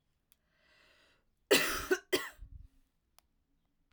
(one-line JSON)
{"cough_length": "3.9 s", "cough_amplitude": 8271, "cough_signal_mean_std_ratio": 0.28, "survey_phase": "alpha (2021-03-01 to 2021-08-12)", "age": "18-44", "gender": "Female", "wearing_mask": "No", "symptom_none": true, "smoker_status": "Never smoked", "respiratory_condition_asthma": false, "respiratory_condition_other": false, "recruitment_source": "REACT", "submission_delay": "1 day", "covid_test_result": "Negative", "covid_test_method": "RT-qPCR"}